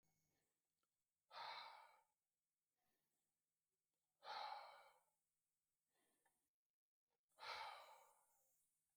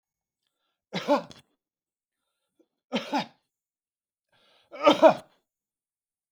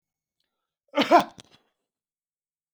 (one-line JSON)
{"exhalation_length": "9.0 s", "exhalation_amplitude": 301, "exhalation_signal_mean_std_ratio": 0.36, "three_cough_length": "6.3 s", "three_cough_amplitude": 18409, "three_cough_signal_mean_std_ratio": 0.23, "cough_length": "2.7 s", "cough_amplitude": 21000, "cough_signal_mean_std_ratio": 0.21, "survey_phase": "beta (2021-08-13 to 2022-03-07)", "age": "65+", "gender": "Male", "wearing_mask": "No", "symptom_none": true, "smoker_status": "Never smoked", "respiratory_condition_asthma": false, "respiratory_condition_other": false, "recruitment_source": "REACT", "submission_delay": "10 days", "covid_test_result": "Negative", "covid_test_method": "RT-qPCR"}